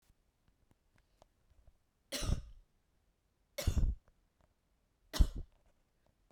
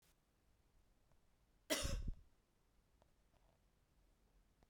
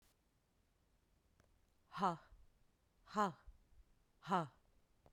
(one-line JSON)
{"three_cough_length": "6.3 s", "three_cough_amplitude": 6925, "three_cough_signal_mean_std_ratio": 0.26, "cough_length": "4.7 s", "cough_amplitude": 2138, "cough_signal_mean_std_ratio": 0.3, "exhalation_length": "5.1 s", "exhalation_amplitude": 2143, "exhalation_signal_mean_std_ratio": 0.28, "survey_phase": "beta (2021-08-13 to 2022-03-07)", "age": "18-44", "gender": "Female", "wearing_mask": "No", "symptom_cough_any": true, "symptom_abdominal_pain": true, "symptom_fatigue": true, "symptom_onset": "12 days", "smoker_status": "Current smoker (1 to 10 cigarettes per day)", "respiratory_condition_asthma": false, "respiratory_condition_other": false, "recruitment_source": "REACT", "submission_delay": "0 days", "covid_test_result": "Negative", "covid_test_method": "RT-qPCR"}